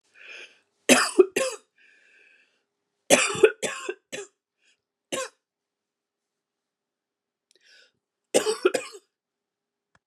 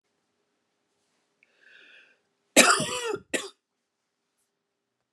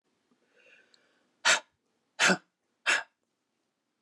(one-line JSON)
{"three_cough_length": "10.1 s", "three_cough_amplitude": 27537, "three_cough_signal_mean_std_ratio": 0.26, "cough_length": "5.1 s", "cough_amplitude": 27370, "cough_signal_mean_std_ratio": 0.23, "exhalation_length": "4.0 s", "exhalation_amplitude": 10568, "exhalation_signal_mean_std_ratio": 0.26, "survey_phase": "beta (2021-08-13 to 2022-03-07)", "age": "45-64", "gender": "Female", "wearing_mask": "No", "symptom_runny_or_blocked_nose": true, "smoker_status": "Never smoked", "respiratory_condition_asthma": false, "respiratory_condition_other": false, "recruitment_source": "Test and Trace", "submission_delay": "2 days", "covid_test_result": "Positive", "covid_test_method": "RT-qPCR", "covid_ct_value": 16.3, "covid_ct_gene": "ORF1ab gene", "covid_ct_mean": 16.9, "covid_viral_load": "2900000 copies/ml", "covid_viral_load_category": "High viral load (>1M copies/ml)"}